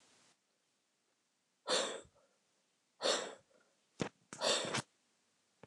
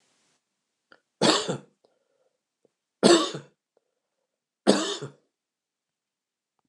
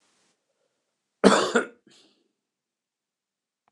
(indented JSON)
{
  "exhalation_length": "5.7 s",
  "exhalation_amplitude": 3303,
  "exhalation_signal_mean_std_ratio": 0.35,
  "three_cough_length": "6.7 s",
  "three_cough_amplitude": 27572,
  "three_cough_signal_mean_std_ratio": 0.26,
  "cough_length": "3.7 s",
  "cough_amplitude": 29204,
  "cough_signal_mean_std_ratio": 0.22,
  "survey_phase": "beta (2021-08-13 to 2022-03-07)",
  "age": "65+",
  "gender": "Male",
  "wearing_mask": "No",
  "symptom_none": true,
  "smoker_status": "Never smoked",
  "respiratory_condition_asthma": false,
  "respiratory_condition_other": false,
  "recruitment_source": "REACT",
  "submission_delay": "1 day",
  "covid_test_result": "Negative",
  "covid_test_method": "RT-qPCR"
}